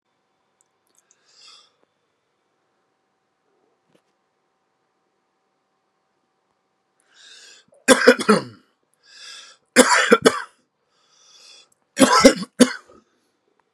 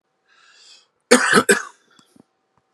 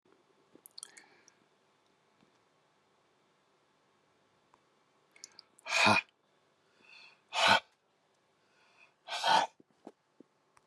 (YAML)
three_cough_length: 13.7 s
three_cough_amplitude: 32768
three_cough_signal_mean_std_ratio: 0.23
cough_length: 2.7 s
cough_amplitude: 32768
cough_signal_mean_std_ratio: 0.3
exhalation_length: 10.7 s
exhalation_amplitude: 8413
exhalation_signal_mean_std_ratio: 0.24
survey_phase: beta (2021-08-13 to 2022-03-07)
age: 45-64
gender: Male
wearing_mask: 'No'
symptom_none: true
smoker_status: Ex-smoker
respiratory_condition_asthma: false
respiratory_condition_other: false
recruitment_source: REACT
submission_delay: 2 days
covid_test_result: Negative
covid_test_method: RT-qPCR